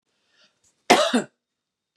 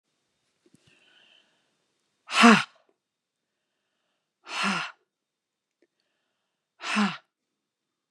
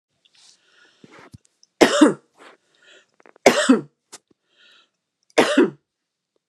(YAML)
cough_length: 2.0 s
cough_amplitude: 32003
cough_signal_mean_std_ratio: 0.29
exhalation_length: 8.1 s
exhalation_amplitude: 25097
exhalation_signal_mean_std_ratio: 0.22
three_cough_length: 6.5 s
three_cough_amplitude: 32768
three_cough_signal_mean_std_ratio: 0.28
survey_phase: beta (2021-08-13 to 2022-03-07)
age: 45-64
gender: Female
wearing_mask: 'No'
symptom_fatigue: true
smoker_status: Ex-smoker
respiratory_condition_asthma: false
respiratory_condition_other: false
recruitment_source: Test and Trace
submission_delay: 1 day
covid_test_result: Positive
covid_test_method: RT-qPCR
covid_ct_value: 20.5
covid_ct_gene: ORF1ab gene
covid_ct_mean: 21.8
covid_viral_load: 71000 copies/ml
covid_viral_load_category: Low viral load (10K-1M copies/ml)